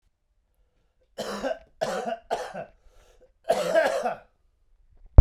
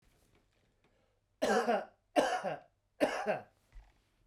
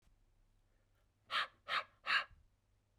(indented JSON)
{
  "cough_length": "5.2 s",
  "cough_amplitude": 32281,
  "cough_signal_mean_std_ratio": 0.29,
  "three_cough_length": "4.3 s",
  "three_cough_amplitude": 6986,
  "three_cough_signal_mean_std_ratio": 0.42,
  "exhalation_length": "3.0 s",
  "exhalation_amplitude": 2706,
  "exhalation_signal_mean_std_ratio": 0.33,
  "survey_phase": "beta (2021-08-13 to 2022-03-07)",
  "age": "18-44",
  "gender": "Male",
  "wearing_mask": "No",
  "symptom_cough_any": true,
  "symptom_fatigue": true,
  "symptom_headache": true,
  "smoker_status": "Ex-smoker",
  "respiratory_condition_asthma": false,
  "respiratory_condition_other": false,
  "recruitment_source": "Test and Trace",
  "submission_delay": "2 days",
  "covid_test_result": "Positive",
  "covid_test_method": "RT-qPCR",
  "covid_ct_value": 16.1,
  "covid_ct_gene": "ORF1ab gene",
  "covid_ct_mean": 16.6,
  "covid_viral_load": "3500000 copies/ml",
  "covid_viral_load_category": "High viral load (>1M copies/ml)"
}